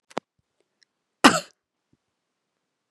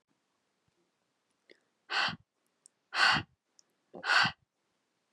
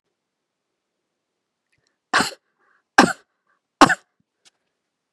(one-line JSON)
{"cough_length": "2.9 s", "cough_amplitude": 32767, "cough_signal_mean_std_ratio": 0.15, "exhalation_length": "5.1 s", "exhalation_amplitude": 9630, "exhalation_signal_mean_std_ratio": 0.3, "three_cough_length": "5.1 s", "three_cough_amplitude": 32768, "three_cough_signal_mean_std_ratio": 0.18, "survey_phase": "beta (2021-08-13 to 2022-03-07)", "age": "18-44", "gender": "Female", "wearing_mask": "No", "symptom_new_continuous_cough": true, "symptom_fever_high_temperature": true, "symptom_change_to_sense_of_smell_or_taste": true, "symptom_onset": "2 days", "smoker_status": "Never smoked", "respiratory_condition_asthma": false, "respiratory_condition_other": false, "recruitment_source": "Test and Trace", "submission_delay": "2 days", "covid_test_result": "Positive", "covid_test_method": "RT-qPCR", "covid_ct_value": 18.8, "covid_ct_gene": "ORF1ab gene"}